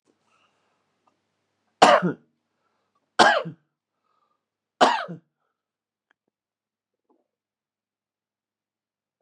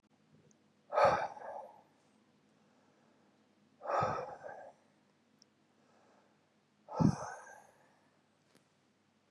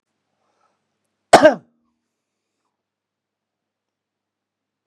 {"three_cough_length": "9.2 s", "three_cough_amplitude": 32768, "three_cough_signal_mean_std_ratio": 0.21, "exhalation_length": "9.3 s", "exhalation_amplitude": 6177, "exhalation_signal_mean_std_ratio": 0.29, "cough_length": "4.9 s", "cough_amplitude": 32768, "cough_signal_mean_std_ratio": 0.15, "survey_phase": "beta (2021-08-13 to 2022-03-07)", "age": "65+", "gender": "Male", "wearing_mask": "No", "symptom_none": true, "smoker_status": "Current smoker (1 to 10 cigarettes per day)", "respiratory_condition_asthma": false, "respiratory_condition_other": false, "recruitment_source": "REACT", "submission_delay": "1 day", "covid_test_result": "Negative", "covid_test_method": "RT-qPCR", "influenza_a_test_result": "Negative", "influenza_b_test_result": "Negative"}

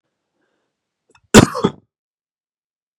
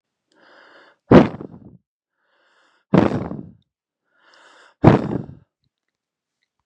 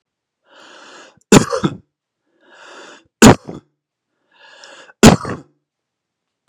{"cough_length": "3.0 s", "cough_amplitude": 32768, "cough_signal_mean_std_ratio": 0.19, "exhalation_length": "6.7 s", "exhalation_amplitude": 32768, "exhalation_signal_mean_std_ratio": 0.25, "three_cough_length": "6.5 s", "three_cough_amplitude": 32768, "three_cough_signal_mean_std_ratio": 0.24, "survey_phase": "beta (2021-08-13 to 2022-03-07)", "age": "18-44", "gender": "Male", "wearing_mask": "No", "symptom_cough_any": true, "symptom_runny_or_blocked_nose": true, "symptom_fatigue": true, "symptom_fever_high_temperature": true, "symptom_headache": true, "symptom_change_to_sense_of_smell_or_taste": true, "symptom_loss_of_taste": true, "smoker_status": "Never smoked", "respiratory_condition_asthma": false, "respiratory_condition_other": false, "recruitment_source": "Test and Trace", "submission_delay": "2 days", "covid_test_result": "Positive", "covid_test_method": "RT-qPCR", "covid_ct_value": 19.7, "covid_ct_gene": "ORF1ab gene", "covid_ct_mean": 20.3, "covid_viral_load": "220000 copies/ml", "covid_viral_load_category": "Low viral load (10K-1M copies/ml)"}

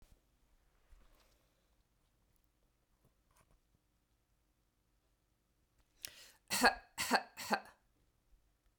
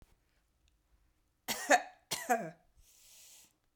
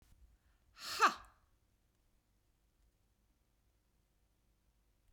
{"three_cough_length": "8.8 s", "three_cough_amplitude": 6245, "three_cough_signal_mean_std_ratio": 0.2, "cough_length": "3.8 s", "cough_amplitude": 8843, "cough_signal_mean_std_ratio": 0.28, "exhalation_length": "5.1 s", "exhalation_amplitude": 4488, "exhalation_signal_mean_std_ratio": 0.17, "survey_phase": "beta (2021-08-13 to 2022-03-07)", "age": "45-64", "gender": "Female", "wearing_mask": "No", "symptom_fatigue": true, "symptom_onset": "2 days", "smoker_status": "Ex-smoker", "respiratory_condition_asthma": false, "respiratory_condition_other": false, "recruitment_source": "Test and Trace", "submission_delay": "1 day", "covid_test_result": "Negative", "covid_test_method": "RT-qPCR"}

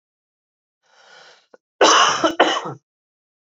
{"cough_length": "3.5 s", "cough_amplitude": 27275, "cough_signal_mean_std_ratio": 0.36, "survey_phase": "beta (2021-08-13 to 2022-03-07)", "age": "18-44", "gender": "Male", "wearing_mask": "No", "symptom_cough_any": true, "symptom_runny_or_blocked_nose": true, "symptom_headache": true, "symptom_change_to_sense_of_smell_or_taste": true, "symptom_loss_of_taste": true, "symptom_onset": "4 days", "smoker_status": "Current smoker (e-cigarettes or vapes only)", "respiratory_condition_asthma": false, "respiratory_condition_other": false, "recruitment_source": "Test and Trace", "submission_delay": "2 days", "covid_test_result": "Positive", "covid_test_method": "RT-qPCR", "covid_ct_value": 17.7, "covid_ct_gene": "ORF1ab gene", "covid_ct_mean": 18.5, "covid_viral_load": "870000 copies/ml", "covid_viral_load_category": "Low viral load (10K-1M copies/ml)"}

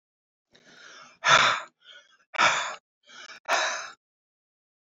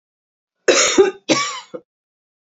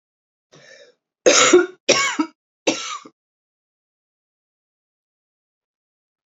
{"exhalation_length": "4.9 s", "exhalation_amplitude": 18793, "exhalation_signal_mean_std_ratio": 0.36, "cough_length": "2.5 s", "cough_amplitude": 29101, "cough_signal_mean_std_ratio": 0.41, "three_cough_length": "6.4 s", "three_cough_amplitude": 32228, "three_cough_signal_mean_std_ratio": 0.28, "survey_phase": "beta (2021-08-13 to 2022-03-07)", "age": "65+", "gender": "Male", "wearing_mask": "No", "symptom_cough_any": true, "symptom_runny_or_blocked_nose": true, "symptom_abdominal_pain": true, "symptom_fatigue": true, "symptom_onset": "4 days", "smoker_status": "Never smoked", "respiratory_condition_asthma": false, "respiratory_condition_other": false, "recruitment_source": "Test and Trace", "submission_delay": "2 days", "covid_test_result": "Positive", "covid_test_method": "RT-qPCR", "covid_ct_value": 17.3, "covid_ct_gene": "ORF1ab gene", "covid_ct_mean": 18.5, "covid_viral_load": "840000 copies/ml", "covid_viral_load_category": "Low viral load (10K-1M copies/ml)"}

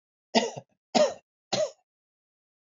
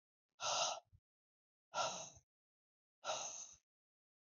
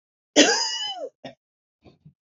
{"three_cough_length": "2.7 s", "three_cough_amplitude": 16292, "three_cough_signal_mean_std_ratio": 0.32, "exhalation_length": "4.3 s", "exhalation_amplitude": 1869, "exhalation_signal_mean_std_ratio": 0.4, "cough_length": "2.2 s", "cough_amplitude": 29005, "cough_signal_mean_std_ratio": 0.37, "survey_phase": "beta (2021-08-13 to 2022-03-07)", "age": "45-64", "gender": "Female", "wearing_mask": "No", "symptom_cough_any": true, "symptom_runny_or_blocked_nose": true, "symptom_sore_throat": true, "symptom_fever_high_temperature": true, "symptom_headache": true, "smoker_status": "Never smoked", "respiratory_condition_asthma": false, "respiratory_condition_other": false, "recruitment_source": "Test and Trace", "submission_delay": "2 days", "covid_test_result": "Positive", "covid_test_method": "RT-qPCR", "covid_ct_value": 24.6, "covid_ct_gene": "ORF1ab gene"}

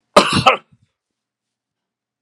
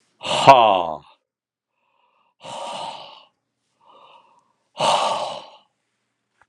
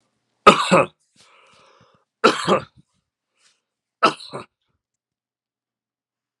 {"cough_length": "2.2 s", "cough_amplitude": 32768, "cough_signal_mean_std_ratio": 0.28, "exhalation_length": "6.5 s", "exhalation_amplitude": 32768, "exhalation_signal_mean_std_ratio": 0.31, "three_cough_length": "6.4 s", "three_cough_amplitude": 32768, "three_cough_signal_mean_std_ratio": 0.24, "survey_phase": "beta (2021-08-13 to 2022-03-07)", "age": "65+", "gender": "Male", "wearing_mask": "No", "symptom_none": true, "smoker_status": "Never smoked", "respiratory_condition_asthma": false, "respiratory_condition_other": false, "recruitment_source": "REACT", "submission_delay": "2 days", "covid_test_result": "Negative", "covid_test_method": "RT-qPCR"}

